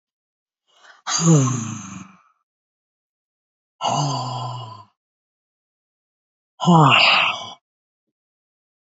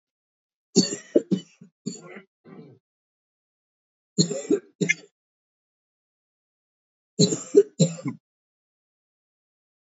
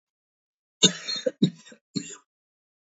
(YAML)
exhalation_length: 9.0 s
exhalation_amplitude: 27102
exhalation_signal_mean_std_ratio: 0.38
three_cough_length: 9.8 s
three_cough_amplitude: 21054
three_cough_signal_mean_std_ratio: 0.25
cough_length: 3.0 s
cough_amplitude: 23671
cough_signal_mean_std_ratio: 0.26
survey_phase: beta (2021-08-13 to 2022-03-07)
age: 45-64
gender: Female
wearing_mask: 'No'
symptom_cough_any: true
symptom_new_continuous_cough: true
symptom_shortness_of_breath: true
symptom_sore_throat: true
symptom_onset: 13 days
smoker_status: Current smoker (11 or more cigarettes per day)
respiratory_condition_asthma: true
respiratory_condition_other: true
recruitment_source: REACT
submission_delay: 2 days
covid_test_result: Negative
covid_test_method: RT-qPCR
covid_ct_value: 43.0
covid_ct_gene: N gene